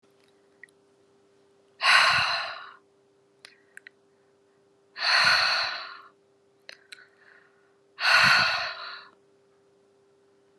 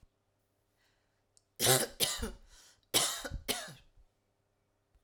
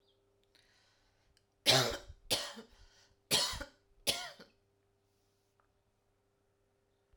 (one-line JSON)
{"exhalation_length": "10.6 s", "exhalation_amplitude": 18759, "exhalation_signal_mean_std_ratio": 0.38, "cough_length": "5.0 s", "cough_amplitude": 8152, "cough_signal_mean_std_ratio": 0.35, "three_cough_length": "7.2 s", "three_cough_amplitude": 9004, "three_cough_signal_mean_std_ratio": 0.28, "survey_phase": "alpha (2021-03-01 to 2021-08-12)", "age": "45-64", "gender": "Female", "wearing_mask": "No", "symptom_fatigue": true, "symptom_headache": true, "smoker_status": "Ex-smoker", "respiratory_condition_asthma": false, "respiratory_condition_other": false, "recruitment_source": "REACT", "submission_delay": "2 days", "covid_test_result": "Negative", "covid_test_method": "RT-qPCR"}